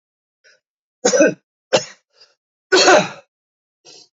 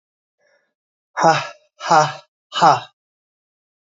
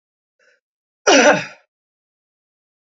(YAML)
three_cough_length: 4.2 s
three_cough_amplitude: 30055
three_cough_signal_mean_std_ratio: 0.33
exhalation_length: 3.8 s
exhalation_amplitude: 28140
exhalation_signal_mean_std_ratio: 0.33
cough_length: 2.8 s
cough_amplitude: 28592
cough_signal_mean_std_ratio: 0.28
survey_phase: beta (2021-08-13 to 2022-03-07)
age: 65+
gender: Male
wearing_mask: 'No'
symptom_cough_any: true
symptom_runny_or_blocked_nose: true
symptom_headache: true
smoker_status: Never smoked
respiratory_condition_asthma: false
respiratory_condition_other: false
recruitment_source: Test and Trace
submission_delay: 1 day
covid_test_result: Positive
covid_test_method: RT-qPCR
covid_ct_value: 32.6
covid_ct_gene: ORF1ab gene
covid_ct_mean: 33.5
covid_viral_load: 10 copies/ml
covid_viral_load_category: Minimal viral load (< 10K copies/ml)